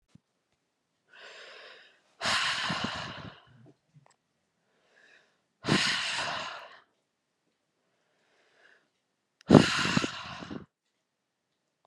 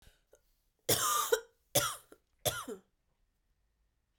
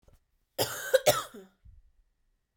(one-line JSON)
{"exhalation_length": "11.9 s", "exhalation_amplitude": 28692, "exhalation_signal_mean_std_ratio": 0.29, "three_cough_length": "4.2 s", "three_cough_amplitude": 7857, "three_cough_signal_mean_std_ratio": 0.36, "cough_length": "2.6 s", "cough_amplitude": 12123, "cough_signal_mean_std_ratio": 0.3, "survey_phase": "alpha (2021-03-01 to 2021-08-12)", "age": "18-44", "gender": "Female", "wearing_mask": "No", "symptom_fever_high_temperature": true, "symptom_headache": true, "symptom_change_to_sense_of_smell_or_taste": true, "symptom_loss_of_taste": true, "smoker_status": "Never smoked", "respiratory_condition_asthma": false, "respiratory_condition_other": false, "recruitment_source": "Test and Trace", "submission_delay": "2 days", "covid_test_result": "Positive", "covid_test_method": "RT-qPCR", "covid_ct_value": 19.3, "covid_ct_gene": "ORF1ab gene", "covid_ct_mean": 19.6, "covid_viral_load": "380000 copies/ml", "covid_viral_load_category": "Low viral load (10K-1M copies/ml)"}